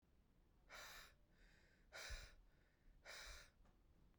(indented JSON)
{
  "exhalation_length": "4.2 s",
  "exhalation_amplitude": 300,
  "exhalation_signal_mean_std_ratio": 0.64,
  "survey_phase": "beta (2021-08-13 to 2022-03-07)",
  "age": "45-64",
  "gender": "Female",
  "wearing_mask": "No",
  "symptom_shortness_of_breath": true,
  "symptom_onset": "9 days",
  "smoker_status": "Never smoked",
  "respiratory_condition_asthma": false,
  "respiratory_condition_other": false,
  "recruitment_source": "REACT",
  "submission_delay": "2 days",
  "covid_test_result": "Negative",
  "covid_test_method": "RT-qPCR",
  "influenza_a_test_result": "Negative",
  "influenza_b_test_result": "Negative"
}